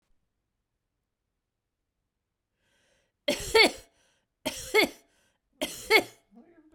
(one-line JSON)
{"three_cough_length": "6.7 s", "three_cough_amplitude": 13214, "three_cough_signal_mean_std_ratio": 0.25, "survey_phase": "beta (2021-08-13 to 2022-03-07)", "age": "45-64", "gender": "Female", "wearing_mask": "No", "symptom_none": true, "symptom_onset": "9 days", "smoker_status": "Never smoked", "respiratory_condition_asthma": false, "respiratory_condition_other": false, "recruitment_source": "REACT", "submission_delay": "6 days", "covid_test_result": "Negative", "covid_test_method": "RT-qPCR"}